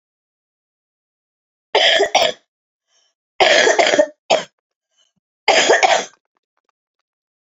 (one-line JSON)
{"three_cough_length": "7.4 s", "three_cough_amplitude": 30792, "three_cough_signal_mean_std_ratio": 0.4, "survey_phase": "beta (2021-08-13 to 2022-03-07)", "age": "45-64", "gender": "Female", "wearing_mask": "No", "symptom_cough_any": true, "symptom_sore_throat": true, "symptom_fatigue": true, "symptom_other": true, "smoker_status": "Ex-smoker", "respiratory_condition_asthma": false, "respiratory_condition_other": false, "recruitment_source": "Test and Trace", "submission_delay": "2 days", "covid_test_result": "Positive", "covid_test_method": "RT-qPCR", "covid_ct_value": 23.3, "covid_ct_gene": "N gene", "covid_ct_mean": 23.3, "covid_viral_load": "22000 copies/ml", "covid_viral_load_category": "Low viral load (10K-1M copies/ml)"}